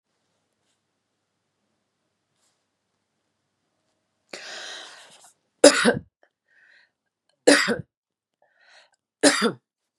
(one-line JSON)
{"three_cough_length": "10.0 s", "three_cough_amplitude": 32695, "three_cough_signal_mean_std_ratio": 0.22, "survey_phase": "beta (2021-08-13 to 2022-03-07)", "age": "65+", "gender": "Female", "wearing_mask": "No", "symptom_none": true, "smoker_status": "Never smoked", "respiratory_condition_asthma": false, "respiratory_condition_other": false, "recruitment_source": "REACT", "submission_delay": "3 days", "covid_test_result": "Negative", "covid_test_method": "RT-qPCR", "influenza_a_test_result": "Negative", "influenza_b_test_result": "Negative"}